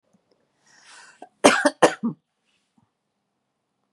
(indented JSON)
{
  "cough_length": "3.9 s",
  "cough_amplitude": 32767,
  "cough_signal_mean_std_ratio": 0.23,
  "survey_phase": "beta (2021-08-13 to 2022-03-07)",
  "age": "45-64",
  "gender": "Female",
  "wearing_mask": "No",
  "symptom_none": true,
  "smoker_status": "Never smoked",
  "respiratory_condition_asthma": false,
  "respiratory_condition_other": false,
  "recruitment_source": "REACT",
  "submission_delay": "2 days",
  "covid_test_result": "Negative",
  "covid_test_method": "RT-qPCR",
  "influenza_a_test_result": "Negative",
  "influenza_b_test_result": "Negative"
}